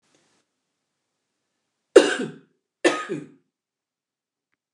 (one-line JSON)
{"cough_length": "4.7 s", "cough_amplitude": 29204, "cough_signal_mean_std_ratio": 0.2, "survey_phase": "beta (2021-08-13 to 2022-03-07)", "age": "65+", "gender": "Female", "wearing_mask": "No", "symptom_none": true, "smoker_status": "Ex-smoker", "respiratory_condition_asthma": false, "respiratory_condition_other": false, "recruitment_source": "REACT", "submission_delay": "2 days", "covid_test_result": "Negative", "covid_test_method": "RT-qPCR", "influenza_a_test_result": "Negative", "influenza_b_test_result": "Negative"}